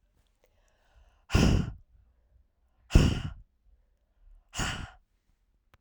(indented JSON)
{
  "exhalation_length": "5.8 s",
  "exhalation_amplitude": 16665,
  "exhalation_signal_mean_std_ratio": 0.29,
  "survey_phase": "beta (2021-08-13 to 2022-03-07)",
  "age": "18-44",
  "gender": "Female",
  "wearing_mask": "No",
  "symptom_cough_any": true,
  "symptom_runny_or_blocked_nose": true,
  "symptom_sore_throat": true,
  "symptom_fatigue": true,
  "symptom_onset": "4 days",
  "smoker_status": "Ex-smoker",
  "respiratory_condition_asthma": false,
  "respiratory_condition_other": false,
  "recruitment_source": "Test and Trace",
  "submission_delay": "2 days",
  "covid_test_result": "Positive",
  "covid_test_method": "ePCR"
}